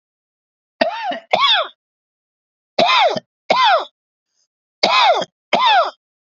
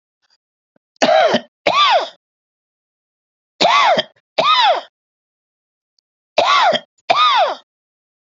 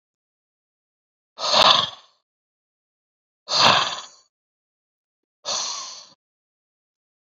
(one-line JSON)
{"cough_length": "6.3 s", "cough_amplitude": 32221, "cough_signal_mean_std_ratio": 0.5, "three_cough_length": "8.4 s", "three_cough_amplitude": 31386, "three_cough_signal_mean_std_ratio": 0.48, "exhalation_length": "7.3 s", "exhalation_amplitude": 32767, "exhalation_signal_mean_std_ratio": 0.3, "survey_phase": "beta (2021-08-13 to 2022-03-07)", "age": "45-64", "gender": "Male", "wearing_mask": "No", "symptom_none": true, "smoker_status": "Never smoked", "respiratory_condition_asthma": false, "respiratory_condition_other": false, "recruitment_source": "REACT", "submission_delay": "1 day", "covid_test_result": "Negative", "covid_test_method": "RT-qPCR", "influenza_a_test_result": "Unknown/Void", "influenza_b_test_result": "Unknown/Void"}